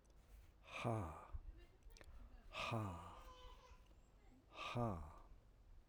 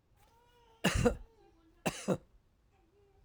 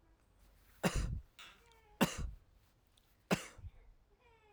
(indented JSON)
{
  "exhalation_length": "5.9 s",
  "exhalation_amplitude": 1115,
  "exhalation_signal_mean_std_ratio": 0.61,
  "cough_length": "3.2 s",
  "cough_amplitude": 5736,
  "cough_signal_mean_std_ratio": 0.33,
  "three_cough_length": "4.5 s",
  "three_cough_amplitude": 5071,
  "three_cough_signal_mean_std_ratio": 0.34,
  "survey_phase": "alpha (2021-03-01 to 2021-08-12)",
  "age": "65+",
  "gender": "Male",
  "wearing_mask": "No",
  "symptom_none": true,
  "smoker_status": "Ex-smoker",
  "respiratory_condition_asthma": false,
  "respiratory_condition_other": false,
  "recruitment_source": "REACT",
  "submission_delay": "1 day",
  "covid_test_result": "Negative",
  "covid_test_method": "RT-qPCR"
}